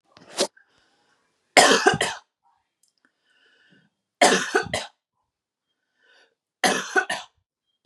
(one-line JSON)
{"three_cough_length": "7.9 s", "three_cough_amplitude": 32529, "three_cough_signal_mean_std_ratio": 0.31, "survey_phase": "beta (2021-08-13 to 2022-03-07)", "age": "18-44", "gender": "Female", "wearing_mask": "No", "symptom_none": true, "smoker_status": "Never smoked", "respiratory_condition_asthma": false, "respiratory_condition_other": false, "recruitment_source": "REACT", "submission_delay": "1 day", "covid_test_result": "Negative", "covid_test_method": "RT-qPCR", "influenza_a_test_result": "Negative", "influenza_b_test_result": "Negative"}